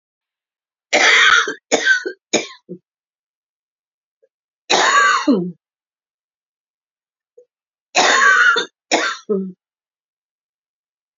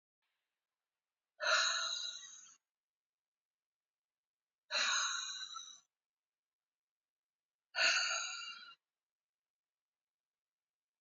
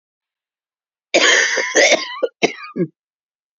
{"three_cough_length": "11.2 s", "three_cough_amplitude": 32767, "three_cough_signal_mean_std_ratio": 0.42, "exhalation_length": "11.0 s", "exhalation_amplitude": 3786, "exhalation_signal_mean_std_ratio": 0.36, "cough_length": "3.6 s", "cough_amplitude": 32767, "cough_signal_mean_std_ratio": 0.45, "survey_phase": "beta (2021-08-13 to 2022-03-07)", "age": "45-64", "gender": "Female", "wearing_mask": "No", "symptom_cough_any": true, "smoker_status": "Never smoked", "respiratory_condition_asthma": true, "respiratory_condition_other": false, "recruitment_source": "REACT", "submission_delay": "5 days", "covid_test_result": "Negative", "covid_test_method": "RT-qPCR", "influenza_a_test_result": "Negative", "influenza_b_test_result": "Negative"}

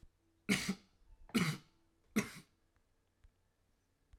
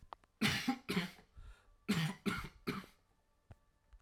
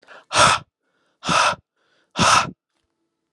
{"three_cough_length": "4.2 s", "three_cough_amplitude": 4113, "three_cough_signal_mean_std_ratio": 0.31, "cough_length": "4.0 s", "cough_amplitude": 3254, "cough_signal_mean_std_ratio": 0.47, "exhalation_length": "3.3 s", "exhalation_amplitude": 31569, "exhalation_signal_mean_std_ratio": 0.41, "survey_phase": "alpha (2021-03-01 to 2021-08-12)", "age": "18-44", "gender": "Male", "wearing_mask": "No", "symptom_none": true, "smoker_status": "Prefer not to say", "respiratory_condition_asthma": false, "respiratory_condition_other": false, "recruitment_source": "REACT", "submission_delay": "1 day", "covid_test_result": "Negative", "covid_test_method": "RT-qPCR"}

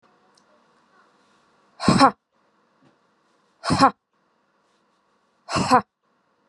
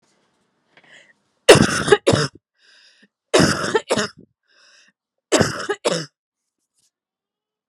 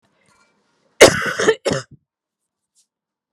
{"exhalation_length": "6.5 s", "exhalation_amplitude": 29104, "exhalation_signal_mean_std_ratio": 0.26, "three_cough_length": "7.7 s", "three_cough_amplitude": 32768, "three_cough_signal_mean_std_ratio": 0.32, "cough_length": "3.3 s", "cough_amplitude": 32768, "cough_signal_mean_std_ratio": 0.27, "survey_phase": "beta (2021-08-13 to 2022-03-07)", "age": "18-44", "gender": "Female", "wearing_mask": "No", "symptom_none": true, "smoker_status": "Never smoked", "respiratory_condition_asthma": false, "respiratory_condition_other": false, "recruitment_source": "REACT", "submission_delay": "6 days", "covid_test_result": "Negative", "covid_test_method": "RT-qPCR"}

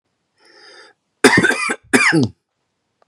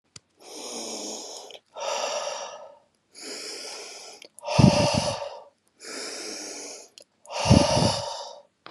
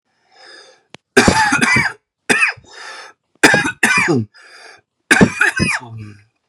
{"cough_length": "3.1 s", "cough_amplitude": 32768, "cough_signal_mean_std_ratio": 0.41, "exhalation_length": "8.7 s", "exhalation_amplitude": 24616, "exhalation_signal_mean_std_ratio": 0.45, "three_cough_length": "6.5 s", "three_cough_amplitude": 32768, "three_cough_signal_mean_std_ratio": 0.49, "survey_phase": "beta (2021-08-13 to 2022-03-07)", "age": "18-44", "gender": "Male", "wearing_mask": "No", "symptom_cough_any": true, "symptom_sore_throat": true, "symptom_fatigue": true, "symptom_headache": true, "smoker_status": "Current smoker (e-cigarettes or vapes only)", "respiratory_condition_asthma": false, "respiratory_condition_other": false, "recruitment_source": "Test and Trace", "submission_delay": "0 days", "covid_test_result": "Negative", "covid_test_method": "LFT"}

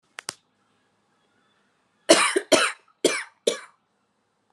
{"cough_length": "4.5 s", "cough_amplitude": 28191, "cough_signal_mean_std_ratio": 0.29, "survey_phase": "alpha (2021-03-01 to 2021-08-12)", "age": "18-44", "gender": "Female", "wearing_mask": "No", "symptom_fatigue": true, "symptom_fever_high_temperature": true, "symptom_headache": true, "symptom_onset": "4 days", "smoker_status": "Never smoked", "respiratory_condition_asthma": false, "respiratory_condition_other": false, "recruitment_source": "Test and Trace", "submission_delay": "1 day", "covid_test_result": "Positive", "covid_test_method": "RT-qPCR", "covid_ct_value": 34.9, "covid_ct_gene": "ORF1ab gene"}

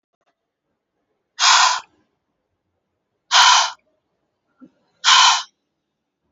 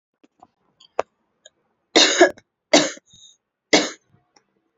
{"exhalation_length": "6.3 s", "exhalation_amplitude": 32334, "exhalation_signal_mean_std_ratio": 0.34, "three_cough_length": "4.8 s", "three_cough_amplitude": 30731, "three_cough_signal_mean_std_ratio": 0.28, "survey_phase": "alpha (2021-03-01 to 2021-08-12)", "age": "18-44", "gender": "Female", "wearing_mask": "No", "symptom_none": true, "smoker_status": "Never smoked", "respiratory_condition_asthma": false, "respiratory_condition_other": false, "recruitment_source": "REACT", "submission_delay": "1 day", "covid_test_result": "Negative", "covid_test_method": "RT-qPCR"}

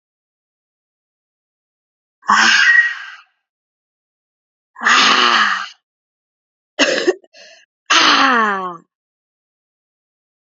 {"exhalation_length": "10.4 s", "exhalation_amplitude": 32768, "exhalation_signal_mean_std_ratio": 0.41, "survey_phase": "alpha (2021-03-01 to 2021-08-12)", "age": "18-44", "gender": "Female", "wearing_mask": "No", "symptom_cough_any": true, "symptom_new_continuous_cough": true, "symptom_shortness_of_breath": true, "symptom_fatigue": true, "symptom_change_to_sense_of_smell_or_taste": true, "symptom_onset": "6 days", "smoker_status": "Ex-smoker", "respiratory_condition_asthma": false, "respiratory_condition_other": false, "recruitment_source": "Test and Trace", "submission_delay": "2 days", "covid_test_result": "Positive", "covid_test_method": "RT-qPCR", "covid_ct_value": 14.7, "covid_ct_gene": "ORF1ab gene", "covid_ct_mean": 15.0, "covid_viral_load": "12000000 copies/ml", "covid_viral_load_category": "High viral load (>1M copies/ml)"}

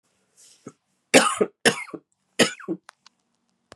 {"three_cough_length": "3.8 s", "three_cough_amplitude": 29248, "three_cough_signal_mean_std_ratio": 0.28, "survey_phase": "beta (2021-08-13 to 2022-03-07)", "age": "45-64", "wearing_mask": "No", "symptom_cough_any": true, "symptom_runny_or_blocked_nose": true, "symptom_sore_throat": true, "symptom_fatigue": true, "symptom_headache": true, "symptom_onset": "3 days", "smoker_status": "Never smoked", "respiratory_condition_asthma": false, "respiratory_condition_other": false, "recruitment_source": "Test and Trace", "submission_delay": "3 days", "covid_test_result": "Positive", "covid_test_method": "RT-qPCR", "covid_ct_value": 28.1, "covid_ct_gene": "N gene"}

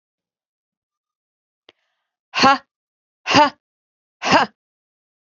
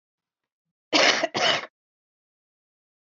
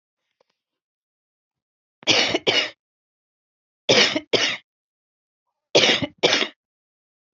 {"exhalation_length": "5.3 s", "exhalation_amplitude": 29533, "exhalation_signal_mean_std_ratio": 0.27, "cough_length": "3.1 s", "cough_amplitude": 26818, "cough_signal_mean_std_ratio": 0.34, "three_cough_length": "7.3 s", "three_cough_amplitude": 31396, "three_cough_signal_mean_std_ratio": 0.35, "survey_phase": "beta (2021-08-13 to 2022-03-07)", "age": "45-64", "gender": "Female", "wearing_mask": "No", "symptom_cough_any": true, "symptom_fatigue": true, "symptom_other": true, "smoker_status": "Never smoked", "respiratory_condition_asthma": true, "respiratory_condition_other": false, "recruitment_source": "Test and Trace", "submission_delay": "2 days", "covid_test_result": "Positive", "covid_test_method": "RT-qPCR"}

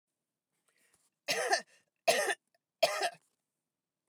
{"three_cough_length": "4.1 s", "three_cough_amplitude": 7047, "three_cough_signal_mean_std_ratio": 0.34, "survey_phase": "beta (2021-08-13 to 2022-03-07)", "age": "45-64", "gender": "Female", "wearing_mask": "No", "symptom_other": true, "smoker_status": "Never smoked", "respiratory_condition_asthma": false, "respiratory_condition_other": false, "recruitment_source": "REACT", "submission_delay": "3 days", "covid_test_result": "Negative", "covid_test_method": "RT-qPCR", "influenza_a_test_result": "Negative", "influenza_b_test_result": "Negative"}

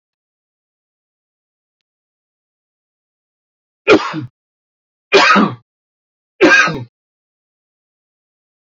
{"three_cough_length": "8.8 s", "three_cough_amplitude": 32767, "three_cough_signal_mean_std_ratio": 0.27, "survey_phase": "beta (2021-08-13 to 2022-03-07)", "age": "45-64", "gender": "Male", "wearing_mask": "No", "symptom_none": true, "smoker_status": "Never smoked", "respiratory_condition_asthma": true, "respiratory_condition_other": false, "recruitment_source": "REACT", "submission_delay": "1 day", "covid_test_result": "Negative", "covid_test_method": "RT-qPCR", "influenza_a_test_result": "Unknown/Void", "influenza_b_test_result": "Unknown/Void"}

